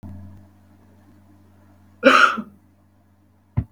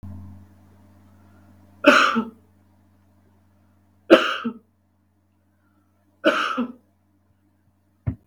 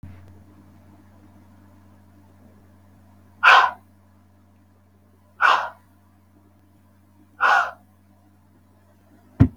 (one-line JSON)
{"cough_length": "3.7 s", "cough_amplitude": 32747, "cough_signal_mean_std_ratio": 0.28, "three_cough_length": "8.3 s", "three_cough_amplitude": 32768, "three_cough_signal_mean_std_ratio": 0.28, "exhalation_length": "9.6 s", "exhalation_amplitude": 32768, "exhalation_signal_mean_std_ratio": 0.26, "survey_phase": "beta (2021-08-13 to 2022-03-07)", "age": "18-44", "gender": "Female", "wearing_mask": "No", "symptom_none": true, "smoker_status": "Never smoked", "respiratory_condition_asthma": false, "respiratory_condition_other": false, "recruitment_source": "REACT", "submission_delay": "3 days", "covid_test_result": "Negative", "covid_test_method": "RT-qPCR", "influenza_a_test_result": "Negative", "influenza_b_test_result": "Negative"}